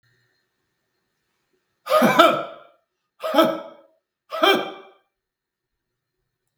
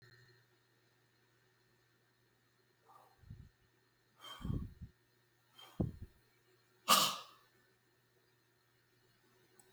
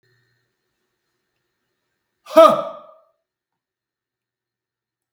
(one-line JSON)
{"three_cough_length": "6.6 s", "three_cough_amplitude": 32768, "three_cough_signal_mean_std_ratio": 0.33, "exhalation_length": "9.7 s", "exhalation_amplitude": 6852, "exhalation_signal_mean_std_ratio": 0.22, "cough_length": "5.1 s", "cough_amplitude": 32768, "cough_signal_mean_std_ratio": 0.18, "survey_phase": "beta (2021-08-13 to 2022-03-07)", "age": "65+", "gender": "Male", "wearing_mask": "No", "symptom_none": true, "smoker_status": "Never smoked", "respiratory_condition_asthma": false, "respiratory_condition_other": false, "recruitment_source": "REACT", "submission_delay": "0 days", "covid_test_result": "Negative", "covid_test_method": "RT-qPCR"}